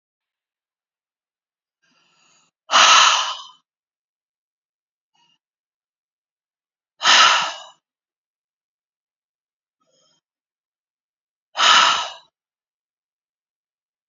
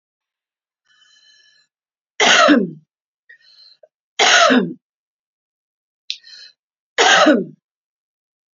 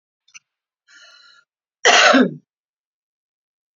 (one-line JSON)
{"exhalation_length": "14.1 s", "exhalation_amplitude": 30677, "exhalation_signal_mean_std_ratio": 0.26, "three_cough_length": "8.5 s", "three_cough_amplitude": 30422, "three_cough_signal_mean_std_ratio": 0.34, "cough_length": "3.8 s", "cough_amplitude": 29534, "cough_signal_mean_std_ratio": 0.29, "survey_phase": "beta (2021-08-13 to 2022-03-07)", "age": "45-64", "gender": "Female", "wearing_mask": "No", "symptom_none": true, "smoker_status": "Ex-smoker", "respiratory_condition_asthma": false, "respiratory_condition_other": false, "recruitment_source": "REACT", "submission_delay": "3 days", "covid_test_result": "Negative", "covid_test_method": "RT-qPCR", "influenza_a_test_result": "Negative", "influenza_b_test_result": "Negative"}